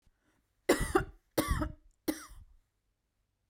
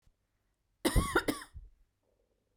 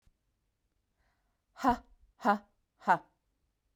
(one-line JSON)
{"three_cough_length": "3.5 s", "three_cough_amplitude": 8354, "three_cough_signal_mean_std_ratio": 0.34, "cough_length": "2.6 s", "cough_amplitude": 6003, "cough_signal_mean_std_ratio": 0.32, "exhalation_length": "3.8 s", "exhalation_amplitude": 8507, "exhalation_signal_mean_std_ratio": 0.25, "survey_phase": "beta (2021-08-13 to 2022-03-07)", "age": "18-44", "gender": "Female", "wearing_mask": "No", "symptom_none": true, "symptom_onset": "5 days", "smoker_status": "Never smoked", "respiratory_condition_asthma": false, "respiratory_condition_other": false, "recruitment_source": "REACT", "submission_delay": "2 days", "covid_test_result": "Negative", "covid_test_method": "RT-qPCR"}